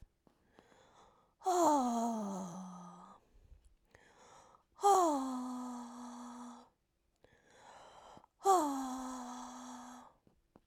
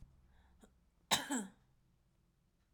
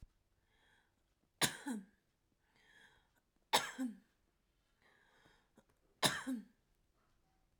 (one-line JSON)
{"exhalation_length": "10.7 s", "exhalation_amplitude": 4268, "exhalation_signal_mean_std_ratio": 0.45, "cough_length": "2.7 s", "cough_amplitude": 4255, "cough_signal_mean_std_ratio": 0.28, "three_cough_length": "7.6 s", "three_cough_amplitude": 5659, "three_cough_signal_mean_std_ratio": 0.26, "survey_phase": "alpha (2021-03-01 to 2021-08-12)", "age": "18-44", "gender": "Female", "wearing_mask": "No", "symptom_none": true, "smoker_status": "Never smoked", "respiratory_condition_asthma": true, "respiratory_condition_other": true, "recruitment_source": "REACT", "submission_delay": "1 day", "covid_test_result": "Negative", "covid_test_method": "RT-qPCR"}